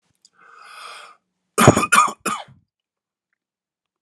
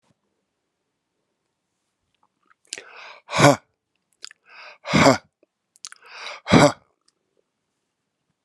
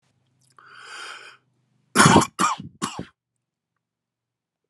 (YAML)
cough_length: 4.0 s
cough_amplitude: 32768
cough_signal_mean_std_ratio: 0.28
exhalation_length: 8.4 s
exhalation_amplitude: 32767
exhalation_signal_mean_std_ratio: 0.23
three_cough_length: 4.7 s
three_cough_amplitude: 29652
three_cough_signal_mean_std_ratio: 0.27
survey_phase: alpha (2021-03-01 to 2021-08-12)
age: 45-64
gender: Male
wearing_mask: 'No'
symptom_none: true
smoker_status: Current smoker (11 or more cigarettes per day)
respiratory_condition_asthma: false
respiratory_condition_other: false
recruitment_source: REACT
submission_delay: 3 days
covid_test_result: Negative
covid_test_method: RT-qPCR